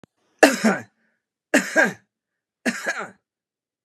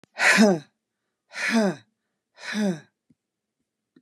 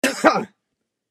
three_cough_length: 3.8 s
three_cough_amplitude: 32767
three_cough_signal_mean_std_ratio: 0.34
exhalation_length: 4.0 s
exhalation_amplitude: 17992
exhalation_signal_mean_std_ratio: 0.39
cough_length: 1.1 s
cough_amplitude: 32767
cough_signal_mean_std_ratio: 0.39
survey_phase: beta (2021-08-13 to 2022-03-07)
age: 45-64
gender: Female
wearing_mask: 'No'
symptom_none: true
smoker_status: Never smoked
respiratory_condition_asthma: false
respiratory_condition_other: false
recruitment_source: REACT
submission_delay: 2 days
covid_test_result: Negative
covid_test_method: RT-qPCR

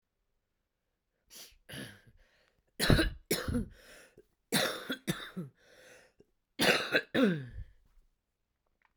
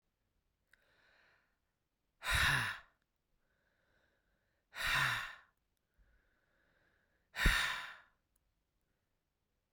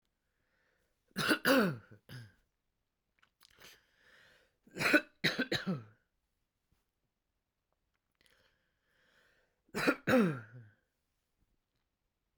cough_length: 9.0 s
cough_amplitude: 13931
cough_signal_mean_std_ratio: 0.36
exhalation_length: 9.7 s
exhalation_amplitude: 4802
exhalation_signal_mean_std_ratio: 0.31
three_cough_length: 12.4 s
three_cough_amplitude: 8641
three_cough_signal_mean_std_ratio: 0.29
survey_phase: beta (2021-08-13 to 2022-03-07)
age: 45-64
gender: Female
wearing_mask: 'No'
symptom_cough_any: true
symptom_runny_or_blocked_nose: true
symptom_sore_throat: true
symptom_fatigue: true
symptom_headache: true
smoker_status: Current smoker (1 to 10 cigarettes per day)
respiratory_condition_asthma: false
respiratory_condition_other: false
recruitment_source: Test and Trace
submission_delay: 2 days
covid_test_result: Positive
covid_test_method: RT-qPCR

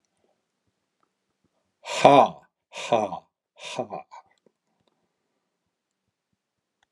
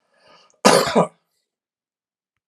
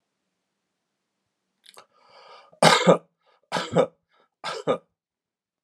exhalation_length: 6.9 s
exhalation_amplitude: 32768
exhalation_signal_mean_std_ratio: 0.22
cough_length: 2.5 s
cough_amplitude: 32767
cough_signal_mean_std_ratio: 0.29
three_cough_length: 5.6 s
three_cough_amplitude: 29988
three_cough_signal_mean_std_ratio: 0.27
survey_phase: alpha (2021-03-01 to 2021-08-12)
age: 45-64
gender: Male
wearing_mask: 'No'
symptom_none: true
smoker_status: Never smoked
respiratory_condition_asthma: false
respiratory_condition_other: false
recruitment_source: REACT
submission_delay: 2 days
covid_test_result: Negative
covid_test_method: RT-qPCR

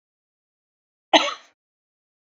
cough_length: 2.3 s
cough_amplitude: 27690
cough_signal_mean_std_ratio: 0.19
survey_phase: beta (2021-08-13 to 2022-03-07)
age: 18-44
gender: Female
wearing_mask: 'No'
symptom_prefer_not_to_say: true
smoker_status: Ex-smoker
respiratory_condition_asthma: false
respiratory_condition_other: false
recruitment_source: REACT
submission_delay: 2 days
covid_test_result: Negative
covid_test_method: RT-qPCR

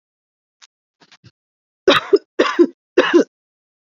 three_cough_length: 3.8 s
three_cough_amplitude: 28233
three_cough_signal_mean_std_ratio: 0.32
survey_phase: beta (2021-08-13 to 2022-03-07)
age: 18-44
gender: Female
wearing_mask: 'No'
symptom_none: true
smoker_status: Never smoked
respiratory_condition_asthma: false
respiratory_condition_other: false
recruitment_source: REACT
submission_delay: 4 days
covid_test_result: Negative
covid_test_method: RT-qPCR
influenza_a_test_result: Negative
influenza_b_test_result: Negative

